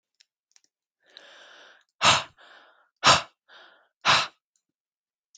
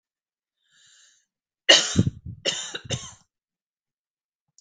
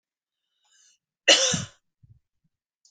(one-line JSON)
{"exhalation_length": "5.4 s", "exhalation_amplitude": 22653, "exhalation_signal_mean_std_ratio": 0.26, "three_cough_length": "4.6 s", "three_cough_amplitude": 31657, "three_cough_signal_mean_std_ratio": 0.26, "cough_length": "2.9 s", "cough_amplitude": 22701, "cough_signal_mean_std_ratio": 0.25, "survey_phase": "beta (2021-08-13 to 2022-03-07)", "age": "18-44", "gender": "Female", "wearing_mask": "No", "symptom_cough_any": true, "symptom_runny_or_blocked_nose": true, "symptom_other": true, "smoker_status": "Never smoked", "respiratory_condition_asthma": true, "respiratory_condition_other": false, "recruitment_source": "Test and Trace", "submission_delay": "1 day", "covid_test_result": "Positive", "covid_test_method": "RT-qPCR", "covid_ct_value": 26.3, "covid_ct_gene": "ORF1ab gene", "covid_ct_mean": 27.5, "covid_viral_load": "940 copies/ml", "covid_viral_load_category": "Minimal viral load (< 10K copies/ml)"}